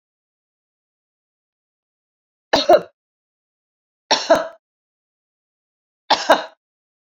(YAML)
three_cough_length: 7.2 s
three_cough_amplitude: 29141
three_cough_signal_mean_std_ratio: 0.23
survey_phase: beta (2021-08-13 to 2022-03-07)
age: 45-64
gender: Female
wearing_mask: 'No'
symptom_cough_any: true
symptom_runny_or_blocked_nose: true
symptom_onset: 3 days
smoker_status: Ex-smoker
respiratory_condition_asthma: false
respiratory_condition_other: false
recruitment_source: Test and Trace
submission_delay: 2 days
covid_test_result: Positive
covid_test_method: RT-qPCR
covid_ct_value: 15.9
covid_ct_gene: ORF1ab gene
covid_ct_mean: 16.1
covid_viral_load: 5300000 copies/ml
covid_viral_load_category: High viral load (>1M copies/ml)